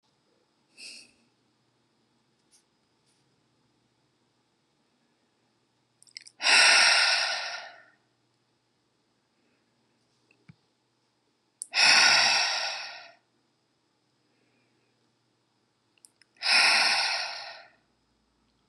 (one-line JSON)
{"exhalation_length": "18.7 s", "exhalation_amplitude": 16571, "exhalation_signal_mean_std_ratio": 0.32, "survey_phase": "beta (2021-08-13 to 2022-03-07)", "age": "45-64", "gender": "Female", "wearing_mask": "No", "symptom_none": true, "smoker_status": "Ex-smoker", "respiratory_condition_asthma": false, "respiratory_condition_other": false, "recruitment_source": "REACT", "submission_delay": "2 days", "covid_test_result": "Negative", "covid_test_method": "RT-qPCR"}